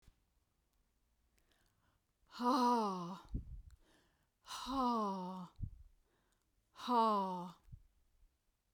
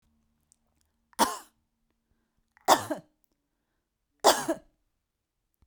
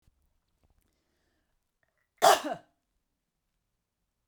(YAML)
exhalation_length: 8.7 s
exhalation_amplitude: 2612
exhalation_signal_mean_std_ratio: 0.45
three_cough_length: 5.7 s
three_cough_amplitude: 18666
three_cough_signal_mean_std_ratio: 0.22
cough_length: 4.3 s
cough_amplitude: 13347
cough_signal_mean_std_ratio: 0.17
survey_phase: beta (2021-08-13 to 2022-03-07)
age: 45-64
gender: Female
wearing_mask: 'No'
symptom_cough_any: true
symptom_sore_throat: true
symptom_onset: 6 days
smoker_status: Never smoked
respiratory_condition_asthma: false
respiratory_condition_other: false
recruitment_source: REACT
submission_delay: 6 days
covid_test_result: Negative
covid_test_method: RT-qPCR